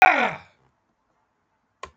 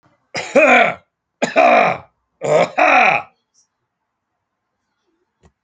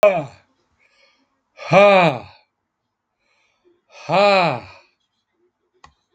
{"cough_length": "2.0 s", "cough_amplitude": 27911, "cough_signal_mean_std_ratio": 0.27, "three_cough_length": "5.6 s", "three_cough_amplitude": 29517, "three_cough_signal_mean_std_ratio": 0.45, "exhalation_length": "6.1 s", "exhalation_amplitude": 29152, "exhalation_signal_mean_std_ratio": 0.35, "survey_phase": "alpha (2021-03-01 to 2021-08-12)", "age": "65+", "gender": "Male", "wearing_mask": "No", "symptom_fatigue": true, "smoker_status": "Ex-smoker", "respiratory_condition_asthma": false, "respiratory_condition_other": false, "recruitment_source": "REACT", "submission_delay": "1 day", "covid_test_result": "Negative", "covid_test_method": "RT-qPCR"}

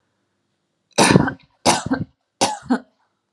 {"three_cough_length": "3.3 s", "three_cough_amplitude": 32768, "three_cough_signal_mean_std_ratio": 0.38, "survey_phase": "alpha (2021-03-01 to 2021-08-12)", "age": "18-44", "gender": "Female", "wearing_mask": "No", "symptom_none": true, "smoker_status": "Ex-smoker", "respiratory_condition_asthma": false, "respiratory_condition_other": false, "recruitment_source": "REACT", "submission_delay": "1 day", "covid_test_result": "Negative", "covid_test_method": "RT-qPCR"}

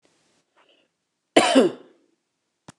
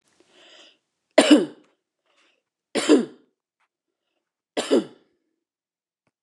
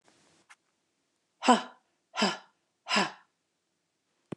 {"cough_length": "2.8 s", "cough_amplitude": 28122, "cough_signal_mean_std_ratio": 0.27, "three_cough_length": "6.2 s", "three_cough_amplitude": 28497, "three_cough_signal_mean_std_ratio": 0.25, "exhalation_length": "4.4 s", "exhalation_amplitude": 16528, "exhalation_signal_mean_std_ratio": 0.26, "survey_phase": "beta (2021-08-13 to 2022-03-07)", "age": "45-64", "gender": "Female", "wearing_mask": "No", "symptom_none": true, "smoker_status": "Never smoked", "respiratory_condition_asthma": false, "respiratory_condition_other": false, "recruitment_source": "REACT", "submission_delay": "2 days", "covid_test_result": "Negative", "covid_test_method": "RT-qPCR", "influenza_a_test_result": "Negative", "influenza_b_test_result": "Negative"}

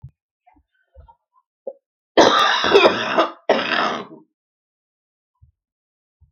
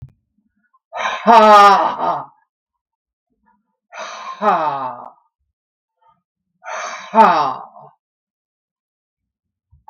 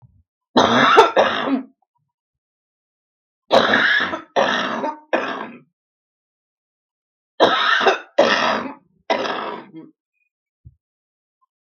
{"cough_length": "6.3 s", "cough_amplitude": 32768, "cough_signal_mean_std_ratio": 0.38, "exhalation_length": "9.9 s", "exhalation_amplitude": 32768, "exhalation_signal_mean_std_ratio": 0.35, "three_cough_length": "11.7 s", "three_cough_amplitude": 32768, "three_cough_signal_mean_std_ratio": 0.45, "survey_phase": "beta (2021-08-13 to 2022-03-07)", "age": "65+", "gender": "Female", "wearing_mask": "No", "symptom_cough_any": true, "symptom_runny_or_blocked_nose": true, "symptom_shortness_of_breath": true, "symptom_sore_throat": true, "symptom_abdominal_pain": true, "symptom_fatigue": true, "symptom_headache": true, "symptom_change_to_sense_of_smell_or_taste": true, "smoker_status": "Ex-smoker", "respiratory_condition_asthma": true, "respiratory_condition_other": true, "recruitment_source": "Test and Trace", "submission_delay": "1 day", "covid_test_result": "Positive", "covid_test_method": "RT-qPCR", "covid_ct_value": 14.6, "covid_ct_gene": "ORF1ab gene", "covid_ct_mean": 15.2, "covid_viral_load": "10000000 copies/ml", "covid_viral_load_category": "High viral load (>1M copies/ml)"}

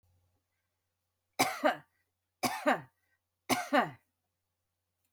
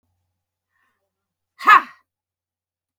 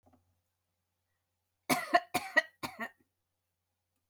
{"three_cough_length": "5.1 s", "three_cough_amplitude": 7106, "three_cough_signal_mean_std_ratio": 0.32, "exhalation_length": "3.0 s", "exhalation_amplitude": 32768, "exhalation_signal_mean_std_ratio": 0.18, "cough_length": "4.1 s", "cough_amplitude": 9449, "cough_signal_mean_std_ratio": 0.24, "survey_phase": "beta (2021-08-13 to 2022-03-07)", "age": "65+", "gender": "Female", "wearing_mask": "No", "symptom_change_to_sense_of_smell_or_taste": true, "smoker_status": "Never smoked", "respiratory_condition_asthma": false, "respiratory_condition_other": false, "recruitment_source": "REACT", "submission_delay": "1 day", "covid_test_result": "Negative", "covid_test_method": "RT-qPCR", "influenza_a_test_result": "Negative", "influenza_b_test_result": "Negative"}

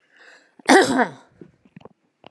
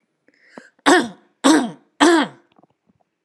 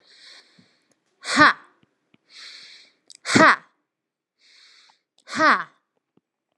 {"cough_length": "2.3 s", "cough_amplitude": 32767, "cough_signal_mean_std_ratio": 0.31, "three_cough_length": "3.2 s", "three_cough_amplitude": 32767, "three_cough_signal_mean_std_ratio": 0.38, "exhalation_length": "6.6 s", "exhalation_amplitude": 31835, "exhalation_signal_mean_std_ratio": 0.26, "survey_phase": "beta (2021-08-13 to 2022-03-07)", "age": "18-44", "gender": "Female", "wearing_mask": "No", "symptom_none": true, "smoker_status": "Never smoked", "respiratory_condition_asthma": false, "respiratory_condition_other": false, "recruitment_source": "REACT", "covid_test_method": "RT-qPCR"}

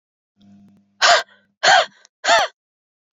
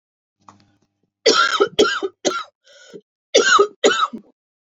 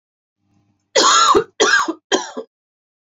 {"exhalation_length": "3.2 s", "exhalation_amplitude": 28700, "exhalation_signal_mean_std_ratio": 0.37, "cough_length": "4.6 s", "cough_amplitude": 31563, "cough_signal_mean_std_ratio": 0.44, "three_cough_length": "3.1 s", "three_cough_amplitude": 29866, "three_cough_signal_mean_std_ratio": 0.47, "survey_phase": "beta (2021-08-13 to 2022-03-07)", "age": "45-64", "gender": "Female", "wearing_mask": "No", "symptom_cough_any": true, "symptom_change_to_sense_of_smell_or_taste": true, "symptom_loss_of_taste": true, "symptom_other": true, "symptom_onset": "3 days", "smoker_status": "Never smoked", "respiratory_condition_asthma": false, "respiratory_condition_other": false, "recruitment_source": "Test and Trace", "submission_delay": "2 days", "covid_test_result": "Positive", "covid_test_method": "ePCR"}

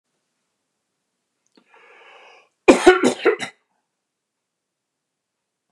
{"cough_length": "5.7 s", "cough_amplitude": 29204, "cough_signal_mean_std_ratio": 0.22, "survey_phase": "beta (2021-08-13 to 2022-03-07)", "age": "65+", "gender": "Male", "wearing_mask": "No", "symptom_none": true, "smoker_status": "Never smoked", "respiratory_condition_asthma": false, "respiratory_condition_other": false, "recruitment_source": "REACT", "submission_delay": "1 day", "covid_test_result": "Negative", "covid_test_method": "RT-qPCR", "influenza_a_test_result": "Negative", "influenza_b_test_result": "Negative"}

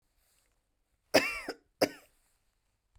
{"cough_length": "3.0 s", "cough_amplitude": 12048, "cough_signal_mean_std_ratio": 0.23, "survey_phase": "beta (2021-08-13 to 2022-03-07)", "age": "45-64", "gender": "Female", "wearing_mask": "No", "symptom_none": true, "smoker_status": "Never smoked", "respiratory_condition_asthma": false, "respiratory_condition_other": true, "recruitment_source": "REACT", "submission_delay": "1 day", "covid_test_result": "Negative", "covid_test_method": "RT-qPCR", "influenza_a_test_result": "Unknown/Void", "influenza_b_test_result": "Unknown/Void"}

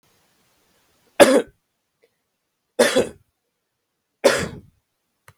{"three_cough_length": "5.4 s", "three_cough_amplitude": 32746, "three_cough_signal_mean_std_ratio": 0.26, "survey_phase": "beta (2021-08-13 to 2022-03-07)", "age": "18-44", "gender": "Male", "wearing_mask": "No", "symptom_none": true, "symptom_onset": "12 days", "smoker_status": "Never smoked", "respiratory_condition_asthma": false, "respiratory_condition_other": false, "recruitment_source": "REACT", "submission_delay": "2 days", "covid_test_result": "Negative", "covid_test_method": "RT-qPCR", "influenza_a_test_result": "Negative", "influenza_b_test_result": "Negative"}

